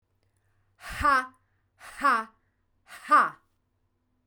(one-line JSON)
{"exhalation_length": "4.3 s", "exhalation_amplitude": 11846, "exhalation_signal_mean_std_ratio": 0.33, "survey_phase": "beta (2021-08-13 to 2022-03-07)", "age": "45-64", "gender": "Female", "wearing_mask": "No", "symptom_none": true, "smoker_status": "Never smoked", "respiratory_condition_asthma": false, "respiratory_condition_other": false, "recruitment_source": "REACT", "submission_delay": "0 days", "covid_test_result": "Negative", "covid_test_method": "RT-qPCR", "influenza_a_test_result": "Negative", "influenza_b_test_result": "Negative"}